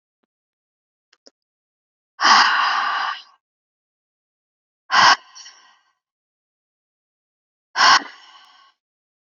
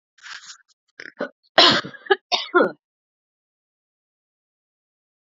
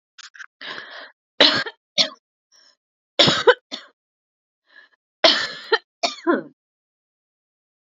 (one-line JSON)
{"exhalation_length": "9.2 s", "exhalation_amplitude": 32557, "exhalation_signal_mean_std_ratio": 0.3, "cough_length": "5.2 s", "cough_amplitude": 28783, "cough_signal_mean_std_ratio": 0.26, "three_cough_length": "7.9 s", "three_cough_amplitude": 30916, "three_cough_signal_mean_std_ratio": 0.3, "survey_phase": "beta (2021-08-13 to 2022-03-07)", "age": "18-44", "gender": "Female", "wearing_mask": "No", "symptom_other": true, "smoker_status": "Current smoker (1 to 10 cigarettes per day)", "respiratory_condition_asthma": false, "respiratory_condition_other": false, "recruitment_source": "Test and Trace", "submission_delay": "0 days", "covid_test_result": "Positive", "covid_test_method": "LFT"}